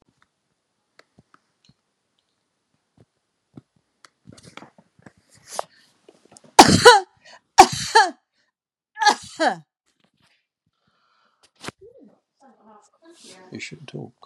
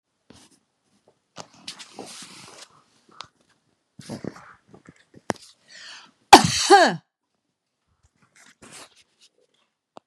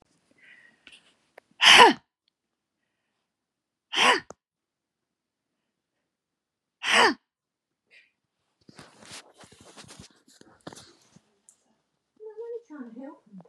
{"three_cough_length": "14.3 s", "three_cough_amplitude": 32768, "three_cough_signal_mean_std_ratio": 0.2, "cough_length": "10.1 s", "cough_amplitude": 32768, "cough_signal_mean_std_ratio": 0.18, "exhalation_length": "13.5 s", "exhalation_amplitude": 31319, "exhalation_signal_mean_std_ratio": 0.21, "survey_phase": "beta (2021-08-13 to 2022-03-07)", "age": "65+", "gender": "Female", "wearing_mask": "No", "symptom_none": true, "smoker_status": "Ex-smoker", "respiratory_condition_asthma": false, "respiratory_condition_other": false, "recruitment_source": "REACT", "submission_delay": "2 days", "covid_test_result": "Negative", "covid_test_method": "RT-qPCR", "influenza_a_test_result": "Negative", "influenza_b_test_result": "Negative"}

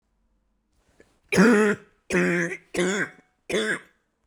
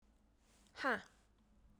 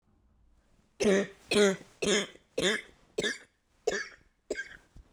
{"three_cough_length": "4.3 s", "three_cough_amplitude": 18716, "three_cough_signal_mean_std_ratio": 0.46, "exhalation_length": "1.8 s", "exhalation_amplitude": 2065, "exhalation_signal_mean_std_ratio": 0.29, "cough_length": "5.1 s", "cough_amplitude": 8699, "cough_signal_mean_std_ratio": 0.42, "survey_phase": "beta (2021-08-13 to 2022-03-07)", "age": "18-44", "gender": "Female", "wearing_mask": "No", "symptom_cough_any": true, "symptom_new_continuous_cough": true, "symptom_runny_or_blocked_nose": true, "symptom_sore_throat": true, "symptom_diarrhoea": true, "symptom_fever_high_temperature": true, "symptom_headache": true, "symptom_change_to_sense_of_smell_or_taste": true, "symptom_onset": "4 days", "smoker_status": "Never smoked", "respiratory_condition_asthma": false, "respiratory_condition_other": false, "recruitment_source": "Test and Trace", "submission_delay": "1 day", "covid_test_result": "Positive", "covid_test_method": "RT-qPCR"}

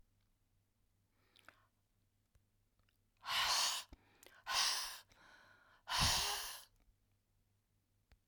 {"exhalation_length": "8.3 s", "exhalation_amplitude": 2622, "exhalation_signal_mean_std_ratio": 0.38, "survey_phase": "alpha (2021-03-01 to 2021-08-12)", "age": "65+", "gender": "Female", "wearing_mask": "No", "symptom_none": true, "smoker_status": "Never smoked", "respiratory_condition_asthma": false, "respiratory_condition_other": false, "recruitment_source": "REACT", "submission_delay": "2 days", "covid_test_result": "Negative", "covid_test_method": "RT-qPCR"}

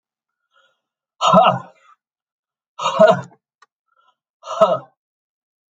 {"exhalation_length": "5.7 s", "exhalation_amplitude": 31683, "exhalation_signal_mean_std_ratio": 0.31, "survey_phase": "alpha (2021-03-01 to 2021-08-12)", "age": "65+", "gender": "Male", "wearing_mask": "No", "symptom_none": true, "smoker_status": "Ex-smoker", "respiratory_condition_asthma": false, "respiratory_condition_other": false, "recruitment_source": "REACT", "submission_delay": "1 day", "covid_test_result": "Negative", "covid_test_method": "RT-qPCR"}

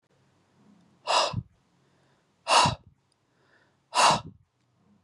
{"exhalation_length": "5.0 s", "exhalation_amplitude": 13304, "exhalation_signal_mean_std_ratio": 0.32, "survey_phase": "beta (2021-08-13 to 2022-03-07)", "age": "18-44", "gender": "Male", "wearing_mask": "No", "symptom_headache": true, "smoker_status": "Never smoked", "respiratory_condition_asthma": false, "respiratory_condition_other": false, "recruitment_source": "REACT", "submission_delay": "1 day", "covid_test_result": "Negative", "covid_test_method": "RT-qPCR", "influenza_a_test_result": "Negative", "influenza_b_test_result": "Negative"}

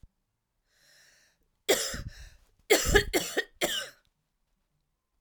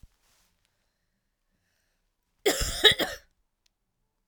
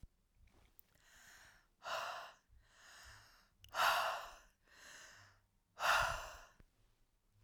{"three_cough_length": "5.2 s", "three_cough_amplitude": 16069, "three_cough_signal_mean_std_ratio": 0.34, "cough_length": "4.3 s", "cough_amplitude": 25958, "cough_signal_mean_std_ratio": 0.24, "exhalation_length": "7.4 s", "exhalation_amplitude": 3005, "exhalation_signal_mean_std_ratio": 0.37, "survey_phase": "beta (2021-08-13 to 2022-03-07)", "age": "45-64", "gender": "Female", "wearing_mask": "No", "symptom_cough_any": true, "symptom_runny_or_blocked_nose": true, "symptom_shortness_of_breath": true, "symptom_sore_throat": true, "symptom_fatigue": true, "symptom_fever_high_temperature": true, "symptom_headache": true, "symptom_change_to_sense_of_smell_or_taste": true, "symptom_other": true, "symptom_onset": "3 days", "smoker_status": "Current smoker (1 to 10 cigarettes per day)", "respiratory_condition_asthma": false, "respiratory_condition_other": false, "recruitment_source": "Test and Trace", "submission_delay": "2 days", "covid_test_result": "Positive", "covid_test_method": "RT-qPCR", "covid_ct_value": 27.8, "covid_ct_gene": "ORF1ab gene"}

